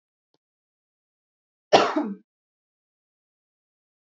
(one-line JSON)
{"cough_length": "4.0 s", "cough_amplitude": 25658, "cough_signal_mean_std_ratio": 0.2, "survey_phase": "beta (2021-08-13 to 2022-03-07)", "age": "18-44", "gender": "Female", "wearing_mask": "No", "symptom_none": true, "smoker_status": "Never smoked", "respiratory_condition_asthma": false, "respiratory_condition_other": false, "recruitment_source": "Test and Trace", "submission_delay": "0 days", "covid_test_result": "Negative", "covid_test_method": "LFT"}